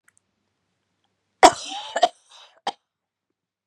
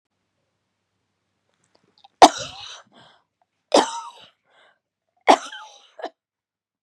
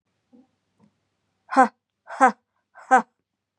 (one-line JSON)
{"cough_length": "3.7 s", "cough_amplitude": 32768, "cough_signal_mean_std_ratio": 0.19, "three_cough_length": "6.8 s", "three_cough_amplitude": 32768, "three_cough_signal_mean_std_ratio": 0.18, "exhalation_length": "3.6 s", "exhalation_amplitude": 25740, "exhalation_signal_mean_std_ratio": 0.24, "survey_phase": "beta (2021-08-13 to 2022-03-07)", "age": "45-64", "gender": "Female", "wearing_mask": "No", "symptom_runny_or_blocked_nose": true, "symptom_onset": "6 days", "smoker_status": "Never smoked", "respiratory_condition_asthma": false, "respiratory_condition_other": false, "recruitment_source": "REACT", "submission_delay": "2 days", "covid_test_result": "Negative", "covid_test_method": "RT-qPCR", "influenza_a_test_result": "Negative", "influenza_b_test_result": "Negative"}